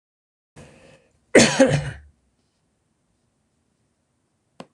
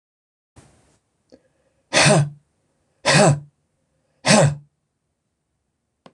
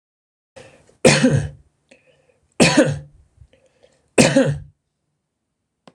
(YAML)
cough_length: 4.7 s
cough_amplitude: 26028
cough_signal_mean_std_ratio: 0.24
exhalation_length: 6.1 s
exhalation_amplitude: 25691
exhalation_signal_mean_std_ratio: 0.33
three_cough_length: 5.9 s
three_cough_amplitude: 26028
three_cough_signal_mean_std_ratio: 0.35
survey_phase: alpha (2021-03-01 to 2021-08-12)
age: 65+
gender: Male
wearing_mask: 'No'
symptom_none: true
smoker_status: Ex-smoker
respiratory_condition_asthma: false
respiratory_condition_other: false
recruitment_source: REACT
submission_delay: 2 days
covid_test_result: Negative
covid_test_method: RT-qPCR